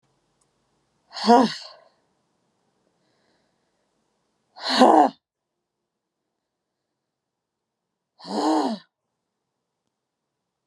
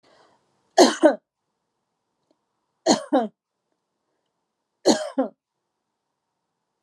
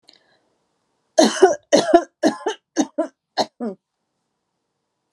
exhalation_length: 10.7 s
exhalation_amplitude: 26777
exhalation_signal_mean_std_ratio: 0.24
three_cough_length: 6.8 s
three_cough_amplitude: 29228
three_cough_signal_mean_std_ratio: 0.25
cough_length: 5.1 s
cough_amplitude: 32733
cough_signal_mean_std_ratio: 0.33
survey_phase: alpha (2021-03-01 to 2021-08-12)
age: 45-64
gender: Female
wearing_mask: 'No'
symptom_none: true
smoker_status: Never smoked
respiratory_condition_asthma: false
respiratory_condition_other: false
recruitment_source: REACT
submission_delay: 1 day
covid_test_result: Negative
covid_test_method: RT-qPCR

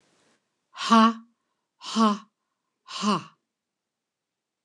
exhalation_length: 4.6 s
exhalation_amplitude: 19016
exhalation_signal_mean_std_ratio: 0.31
survey_phase: beta (2021-08-13 to 2022-03-07)
age: 65+
gender: Female
wearing_mask: 'No'
symptom_none: true
smoker_status: Never smoked
respiratory_condition_asthma: false
respiratory_condition_other: false
recruitment_source: REACT
submission_delay: 1 day
covid_test_result: Negative
covid_test_method: RT-qPCR
influenza_a_test_result: Negative
influenza_b_test_result: Negative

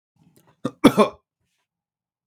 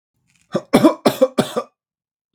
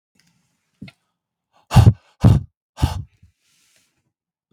cough_length: 2.3 s
cough_amplitude: 32767
cough_signal_mean_std_ratio: 0.22
three_cough_length: 2.3 s
three_cough_amplitude: 32767
three_cough_signal_mean_std_ratio: 0.36
exhalation_length: 4.5 s
exhalation_amplitude: 32768
exhalation_signal_mean_std_ratio: 0.25
survey_phase: beta (2021-08-13 to 2022-03-07)
age: 18-44
gender: Male
wearing_mask: 'No'
symptom_none: true
smoker_status: Never smoked
respiratory_condition_asthma: false
respiratory_condition_other: false
recruitment_source: REACT
submission_delay: 9 days
covid_test_result: Negative
covid_test_method: RT-qPCR
influenza_a_test_result: Negative
influenza_b_test_result: Negative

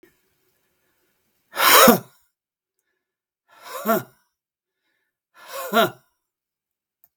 exhalation_length: 7.2 s
exhalation_amplitude: 32768
exhalation_signal_mean_std_ratio: 0.26
survey_phase: beta (2021-08-13 to 2022-03-07)
age: 45-64
gender: Male
wearing_mask: 'No'
symptom_none: true
smoker_status: Ex-smoker
respiratory_condition_asthma: true
respiratory_condition_other: false
recruitment_source: REACT
submission_delay: 2 days
covid_test_result: Negative
covid_test_method: RT-qPCR
influenza_a_test_result: Negative
influenza_b_test_result: Negative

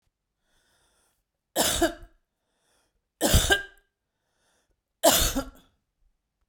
three_cough_length: 6.5 s
three_cough_amplitude: 20948
three_cough_signal_mean_std_ratio: 0.32
survey_phase: beta (2021-08-13 to 2022-03-07)
age: 45-64
gender: Female
wearing_mask: 'No'
symptom_none: true
smoker_status: Ex-smoker
respiratory_condition_asthma: false
respiratory_condition_other: false
recruitment_source: REACT
submission_delay: 2 days
covid_test_result: Negative
covid_test_method: RT-qPCR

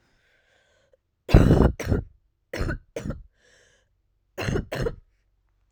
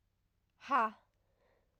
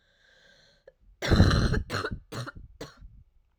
three_cough_length: 5.7 s
three_cough_amplitude: 27840
three_cough_signal_mean_std_ratio: 0.33
exhalation_length: 1.8 s
exhalation_amplitude: 3822
exhalation_signal_mean_std_ratio: 0.28
cough_length: 3.6 s
cough_amplitude: 16180
cough_signal_mean_std_ratio: 0.4
survey_phase: alpha (2021-03-01 to 2021-08-12)
age: 18-44
gender: Female
wearing_mask: 'No'
symptom_cough_any: true
symptom_shortness_of_breath: true
symptom_fatigue: true
symptom_headache: true
symptom_change_to_sense_of_smell_or_taste: true
symptom_loss_of_taste: true
smoker_status: Never smoked
respiratory_condition_asthma: true
respiratory_condition_other: false
recruitment_source: Test and Trace
submission_delay: 2 days
covid_test_result: Positive
covid_test_method: LFT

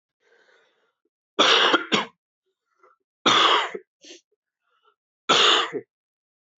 three_cough_length: 6.6 s
three_cough_amplitude: 22193
three_cough_signal_mean_std_ratio: 0.38
survey_phase: alpha (2021-03-01 to 2021-08-12)
age: 18-44
gender: Male
wearing_mask: 'No'
symptom_cough_any: true
symptom_fatigue: true
symptom_headache: true
symptom_change_to_sense_of_smell_or_taste: true
symptom_onset: 4 days
smoker_status: Never smoked
respiratory_condition_asthma: false
respiratory_condition_other: false
recruitment_source: Test and Trace
submission_delay: 1 day
covid_test_result: Positive
covid_test_method: RT-qPCR
covid_ct_value: 15.0
covid_ct_gene: ORF1ab gene
covid_ct_mean: 15.4
covid_viral_load: 8700000 copies/ml
covid_viral_load_category: High viral load (>1M copies/ml)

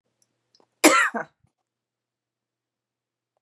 cough_length: 3.4 s
cough_amplitude: 32039
cough_signal_mean_std_ratio: 0.22
survey_phase: beta (2021-08-13 to 2022-03-07)
age: 45-64
gender: Female
wearing_mask: 'No'
symptom_cough_any: true
symptom_sore_throat: true
smoker_status: Never smoked
respiratory_condition_asthma: false
respiratory_condition_other: false
recruitment_source: Test and Trace
submission_delay: 1 day
covid_test_result: Negative
covid_test_method: LFT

